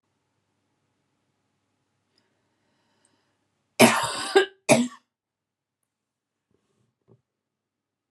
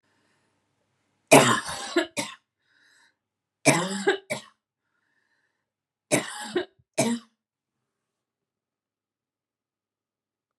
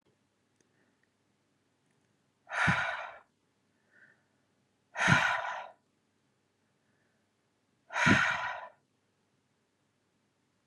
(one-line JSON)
{"cough_length": "8.1 s", "cough_amplitude": 29663, "cough_signal_mean_std_ratio": 0.21, "three_cough_length": "10.6 s", "three_cough_amplitude": 28205, "three_cough_signal_mean_std_ratio": 0.27, "exhalation_length": "10.7 s", "exhalation_amplitude": 10729, "exhalation_signal_mean_std_ratio": 0.31, "survey_phase": "beta (2021-08-13 to 2022-03-07)", "age": "18-44", "gender": "Female", "wearing_mask": "No", "symptom_headache": true, "smoker_status": "Never smoked", "respiratory_condition_asthma": false, "respiratory_condition_other": false, "recruitment_source": "REACT", "submission_delay": "2 days", "covid_test_result": "Negative", "covid_test_method": "RT-qPCR", "influenza_a_test_result": "Negative", "influenza_b_test_result": "Negative"}